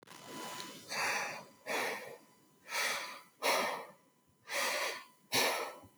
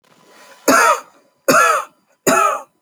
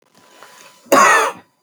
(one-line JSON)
{"exhalation_length": "6.0 s", "exhalation_amplitude": 4110, "exhalation_signal_mean_std_ratio": 0.64, "three_cough_length": "2.8 s", "three_cough_amplitude": 32334, "three_cough_signal_mean_std_ratio": 0.52, "cough_length": "1.6 s", "cough_amplitude": 30426, "cough_signal_mean_std_ratio": 0.43, "survey_phase": "alpha (2021-03-01 to 2021-08-12)", "age": "18-44", "gender": "Female", "wearing_mask": "No", "symptom_fatigue": true, "symptom_headache": true, "smoker_status": "Never smoked", "respiratory_condition_asthma": false, "respiratory_condition_other": false, "recruitment_source": "REACT", "submission_delay": "3 days", "covid_test_result": "Negative", "covid_test_method": "RT-qPCR"}